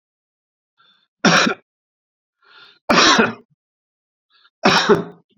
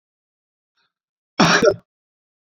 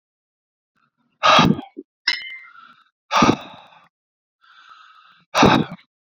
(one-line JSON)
{"three_cough_length": "5.4 s", "three_cough_amplitude": 29050, "three_cough_signal_mean_std_ratio": 0.36, "cough_length": "2.5 s", "cough_amplitude": 27851, "cough_signal_mean_std_ratio": 0.29, "exhalation_length": "6.1 s", "exhalation_amplitude": 32241, "exhalation_signal_mean_std_ratio": 0.34, "survey_phase": "beta (2021-08-13 to 2022-03-07)", "age": "65+", "gender": "Male", "wearing_mask": "No", "symptom_none": true, "smoker_status": "Ex-smoker", "respiratory_condition_asthma": false, "respiratory_condition_other": false, "recruitment_source": "REACT", "submission_delay": "1 day", "covid_test_result": "Negative", "covid_test_method": "RT-qPCR"}